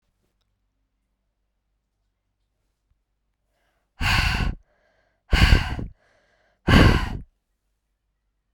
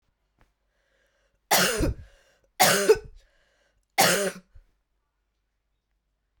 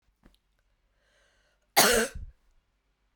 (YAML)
exhalation_length: 8.5 s
exhalation_amplitude: 27077
exhalation_signal_mean_std_ratio: 0.3
three_cough_length: 6.4 s
three_cough_amplitude: 19897
three_cough_signal_mean_std_ratio: 0.33
cough_length: 3.2 s
cough_amplitude: 16092
cough_signal_mean_std_ratio: 0.27
survey_phase: beta (2021-08-13 to 2022-03-07)
age: 18-44
gender: Female
wearing_mask: 'No'
symptom_runny_or_blocked_nose: true
symptom_fatigue: true
symptom_fever_high_temperature: true
symptom_headache: true
symptom_change_to_sense_of_smell_or_taste: true
symptom_loss_of_taste: true
symptom_other: true
smoker_status: Ex-smoker
respiratory_condition_asthma: false
respiratory_condition_other: false
recruitment_source: Test and Trace
submission_delay: 3 days
covid_test_result: Positive
covid_test_method: LFT